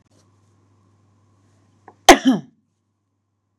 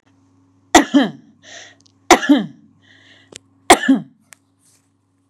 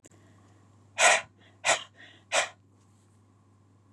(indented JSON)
{
  "cough_length": "3.6 s",
  "cough_amplitude": 32768,
  "cough_signal_mean_std_ratio": 0.18,
  "three_cough_length": "5.3 s",
  "three_cough_amplitude": 32768,
  "three_cough_signal_mean_std_ratio": 0.29,
  "exhalation_length": "3.9 s",
  "exhalation_amplitude": 15299,
  "exhalation_signal_mean_std_ratio": 0.3,
  "survey_phase": "beta (2021-08-13 to 2022-03-07)",
  "age": "45-64",
  "gender": "Female",
  "wearing_mask": "No",
  "symptom_none": true,
  "smoker_status": "Never smoked",
  "respiratory_condition_asthma": false,
  "respiratory_condition_other": false,
  "recruitment_source": "REACT",
  "submission_delay": "2 days",
  "covid_test_result": "Negative",
  "covid_test_method": "RT-qPCR",
  "influenza_a_test_result": "Unknown/Void",
  "influenza_b_test_result": "Unknown/Void"
}